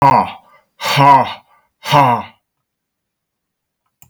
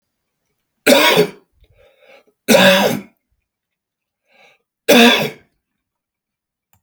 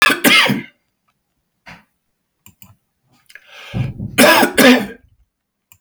{"exhalation_length": "4.1 s", "exhalation_amplitude": 32766, "exhalation_signal_mean_std_ratio": 0.41, "three_cough_length": "6.8 s", "three_cough_amplitude": 32768, "three_cough_signal_mean_std_ratio": 0.36, "cough_length": "5.8 s", "cough_amplitude": 32768, "cough_signal_mean_std_ratio": 0.39, "survey_phase": "beta (2021-08-13 to 2022-03-07)", "age": "65+", "gender": "Male", "wearing_mask": "No", "symptom_none": true, "smoker_status": "Never smoked", "respiratory_condition_asthma": true, "respiratory_condition_other": false, "recruitment_source": "REACT", "submission_delay": "2 days", "covid_test_result": "Negative", "covid_test_method": "RT-qPCR", "influenza_a_test_result": "Negative", "influenza_b_test_result": "Negative"}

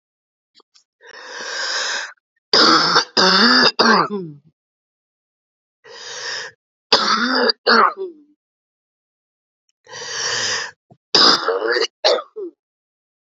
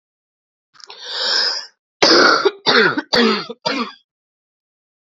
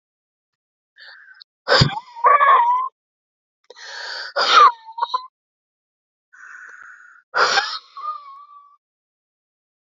{"three_cough_length": "13.2 s", "three_cough_amplitude": 32768, "three_cough_signal_mean_std_ratio": 0.47, "cough_length": "5.0 s", "cough_amplitude": 32768, "cough_signal_mean_std_ratio": 0.49, "exhalation_length": "9.8 s", "exhalation_amplitude": 28412, "exhalation_signal_mean_std_ratio": 0.37, "survey_phase": "beta (2021-08-13 to 2022-03-07)", "age": "45-64", "gender": "Female", "wearing_mask": "No", "symptom_cough_any": true, "symptom_runny_or_blocked_nose": true, "symptom_sore_throat": true, "symptom_fatigue": true, "symptom_fever_high_temperature": true, "symptom_headache": true, "symptom_change_to_sense_of_smell_or_taste": true, "symptom_loss_of_taste": true, "symptom_onset": "3 days", "smoker_status": "Ex-smoker", "respiratory_condition_asthma": true, "respiratory_condition_other": false, "recruitment_source": "Test and Trace", "submission_delay": "2 days", "covid_test_result": "Positive", "covid_test_method": "RT-qPCR", "covid_ct_value": 17.3, "covid_ct_gene": "ORF1ab gene"}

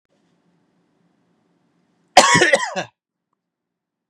{"cough_length": "4.1 s", "cough_amplitude": 32768, "cough_signal_mean_std_ratio": 0.26, "survey_phase": "beta (2021-08-13 to 2022-03-07)", "age": "45-64", "gender": "Male", "wearing_mask": "No", "symptom_runny_or_blocked_nose": true, "smoker_status": "Never smoked", "respiratory_condition_asthma": false, "respiratory_condition_other": false, "recruitment_source": "REACT", "submission_delay": "0 days", "covid_test_result": "Negative", "covid_test_method": "RT-qPCR", "influenza_a_test_result": "Unknown/Void", "influenza_b_test_result": "Unknown/Void"}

